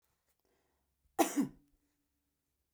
cough_length: 2.7 s
cough_amplitude: 5907
cough_signal_mean_std_ratio: 0.22
survey_phase: beta (2021-08-13 to 2022-03-07)
age: 65+
gender: Female
wearing_mask: 'No'
symptom_cough_any: true
symptom_fatigue: true
smoker_status: Ex-smoker
respiratory_condition_asthma: true
respiratory_condition_other: false
recruitment_source: Test and Trace
submission_delay: 2 days
covid_test_result: Positive
covid_test_method: RT-qPCR
covid_ct_value: 25.2
covid_ct_gene: ORF1ab gene
covid_ct_mean: 25.7
covid_viral_load: 3800 copies/ml
covid_viral_load_category: Minimal viral load (< 10K copies/ml)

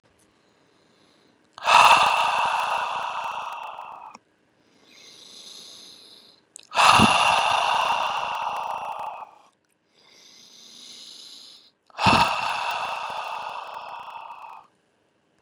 exhalation_length: 15.4 s
exhalation_amplitude: 29048
exhalation_signal_mean_std_ratio: 0.46
survey_phase: beta (2021-08-13 to 2022-03-07)
age: 18-44
gender: Male
wearing_mask: 'No'
symptom_cough_any: true
symptom_sore_throat: true
symptom_fatigue: true
symptom_headache: true
smoker_status: Never smoked
respiratory_condition_asthma: false
respiratory_condition_other: false
recruitment_source: Test and Trace
submission_delay: 2 days
covid_test_result: Positive
covid_test_method: LFT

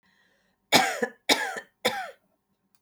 three_cough_length: 2.8 s
three_cough_amplitude: 24398
three_cough_signal_mean_std_ratio: 0.37
survey_phase: beta (2021-08-13 to 2022-03-07)
age: 45-64
gender: Female
wearing_mask: 'No'
symptom_none: true
smoker_status: Never smoked
respiratory_condition_asthma: true
respiratory_condition_other: false
recruitment_source: REACT
submission_delay: 3 days
covid_test_result: Negative
covid_test_method: RT-qPCR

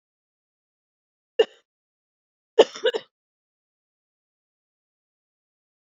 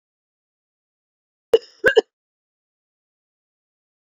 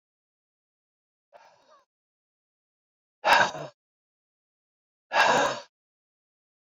three_cough_length: 6.0 s
three_cough_amplitude: 27608
three_cough_signal_mean_std_ratio: 0.13
cough_length: 4.0 s
cough_amplitude: 26471
cough_signal_mean_std_ratio: 0.15
exhalation_length: 6.7 s
exhalation_amplitude: 17750
exhalation_signal_mean_std_ratio: 0.26
survey_phase: beta (2021-08-13 to 2022-03-07)
age: 45-64
gender: Female
wearing_mask: 'No'
symptom_new_continuous_cough: true
symptom_runny_or_blocked_nose: true
symptom_shortness_of_breath: true
symptom_abdominal_pain: true
symptom_diarrhoea: true
symptom_fatigue: true
symptom_headache: true
symptom_change_to_sense_of_smell_or_taste: true
symptom_loss_of_taste: true
symptom_onset: 9 days
smoker_status: Ex-smoker
respiratory_condition_asthma: false
respiratory_condition_other: false
recruitment_source: Test and Trace
submission_delay: 1 day
covid_test_result: Positive
covid_test_method: RT-qPCR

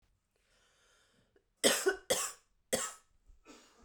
three_cough_length: 3.8 s
three_cough_amplitude: 9021
three_cough_signal_mean_std_ratio: 0.32
survey_phase: beta (2021-08-13 to 2022-03-07)
age: 45-64
gender: Female
wearing_mask: 'No'
symptom_runny_or_blocked_nose: true
symptom_headache: true
smoker_status: Never smoked
respiratory_condition_asthma: false
respiratory_condition_other: false
recruitment_source: Test and Trace
submission_delay: 2 days
covid_test_result: Positive
covid_test_method: RT-qPCR
covid_ct_value: 27.4
covid_ct_gene: ORF1ab gene
covid_ct_mean: 27.8
covid_viral_load: 780 copies/ml
covid_viral_load_category: Minimal viral load (< 10K copies/ml)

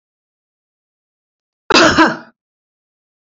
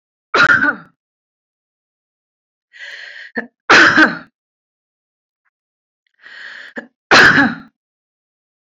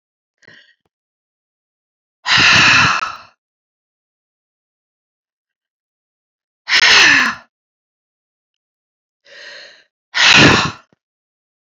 cough_length: 3.3 s
cough_amplitude: 32103
cough_signal_mean_std_ratio: 0.29
three_cough_length: 8.7 s
three_cough_amplitude: 32768
three_cough_signal_mean_std_ratio: 0.33
exhalation_length: 11.6 s
exhalation_amplitude: 32626
exhalation_signal_mean_std_ratio: 0.34
survey_phase: beta (2021-08-13 to 2022-03-07)
age: 65+
gender: Female
wearing_mask: 'No'
symptom_none: true
smoker_status: Ex-smoker
respiratory_condition_asthma: false
respiratory_condition_other: false
recruitment_source: REACT
submission_delay: 1 day
covid_test_result: Negative
covid_test_method: RT-qPCR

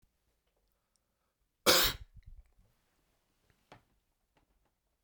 cough_length: 5.0 s
cough_amplitude: 10393
cough_signal_mean_std_ratio: 0.19
survey_phase: beta (2021-08-13 to 2022-03-07)
age: 45-64
gender: Male
wearing_mask: 'No'
symptom_none: true
smoker_status: Never smoked
respiratory_condition_asthma: false
respiratory_condition_other: false
recruitment_source: REACT
submission_delay: 2 days
covid_test_result: Negative
covid_test_method: RT-qPCR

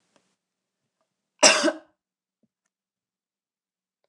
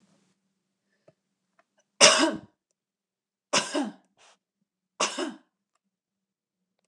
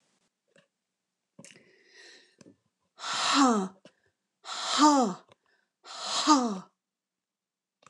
cough_length: 4.1 s
cough_amplitude: 27635
cough_signal_mean_std_ratio: 0.19
three_cough_length: 6.9 s
three_cough_amplitude: 28704
three_cough_signal_mean_std_ratio: 0.24
exhalation_length: 7.9 s
exhalation_amplitude: 14314
exhalation_signal_mean_std_ratio: 0.36
survey_phase: beta (2021-08-13 to 2022-03-07)
age: 45-64
gender: Female
wearing_mask: 'No'
symptom_none: true
smoker_status: Never smoked
respiratory_condition_asthma: false
respiratory_condition_other: false
recruitment_source: REACT
submission_delay: 1 day
covid_test_result: Negative
covid_test_method: RT-qPCR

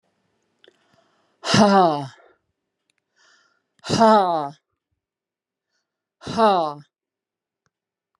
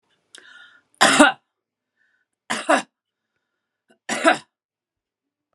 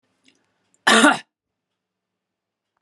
exhalation_length: 8.2 s
exhalation_amplitude: 28274
exhalation_signal_mean_std_ratio: 0.33
three_cough_length: 5.5 s
three_cough_amplitude: 32767
three_cough_signal_mean_std_ratio: 0.27
cough_length: 2.8 s
cough_amplitude: 31452
cough_signal_mean_std_ratio: 0.26
survey_phase: beta (2021-08-13 to 2022-03-07)
age: 45-64
gender: Female
wearing_mask: 'No'
symptom_cough_any: true
symptom_runny_or_blocked_nose: true
symptom_headache: true
symptom_onset: 5 days
smoker_status: Never smoked
respiratory_condition_asthma: false
respiratory_condition_other: false
recruitment_source: Test and Trace
submission_delay: 2 days
covid_test_result: Positive
covid_test_method: RT-qPCR
covid_ct_value: 16.3
covid_ct_gene: ORF1ab gene
covid_ct_mean: 16.8
covid_viral_load: 3000000 copies/ml
covid_viral_load_category: High viral load (>1M copies/ml)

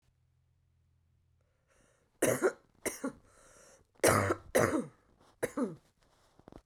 three_cough_length: 6.7 s
three_cough_amplitude: 9181
three_cough_signal_mean_std_ratio: 0.34
survey_phase: beta (2021-08-13 to 2022-03-07)
age: 45-64
gender: Female
wearing_mask: 'No'
symptom_cough_any: true
symptom_runny_or_blocked_nose: true
symptom_sore_throat: true
symptom_fatigue: true
symptom_fever_high_temperature: true
symptom_headache: true
symptom_other: true
symptom_onset: 3 days
smoker_status: Never smoked
respiratory_condition_asthma: false
respiratory_condition_other: false
recruitment_source: Test and Trace
submission_delay: 2 days
covid_test_result: Positive
covid_test_method: ePCR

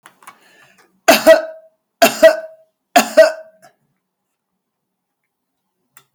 three_cough_length: 6.1 s
three_cough_amplitude: 32768
three_cough_signal_mean_std_ratio: 0.29
survey_phase: beta (2021-08-13 to 2022-03-07)
age: 65+
gender: Female
wearing_mask: 'No'
symptom_none: true
smoker_status: Ex-smoker
respiratory_condition_asthma: false
respiratory_condition_other: false
recruitment_source: REACT
submission_delay: 2 days
covid_test_result: Negative
covid_test_method: RT-qPCR
influenza_a_test_result: Negative
influenza_b_test_result: Negative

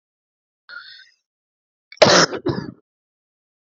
cough_length: 3.8 s
cough_amplitude: 30746
cough_signal_mean_std_ratio: 0.26
survey_phase: alpha (2021-03-01 to 2021-08-12)
age: 45-64
gender: Female
wearing_mask: 'No'
symptom_cough_any: true
symptom_new_continuous_cough: true
symptom_fatigue: true
symptom_fever_high_temperature: true
symptom_headache: true
symptom_onset: 2 days
smoker_status: Never smoked
respiratory_condition_asthma: false
respiratory_condition_other: false
recruitment_source: Test and Trace
submission_delay: 2 days
covid_test_result: Positive
covid_test_method: RT-qPCR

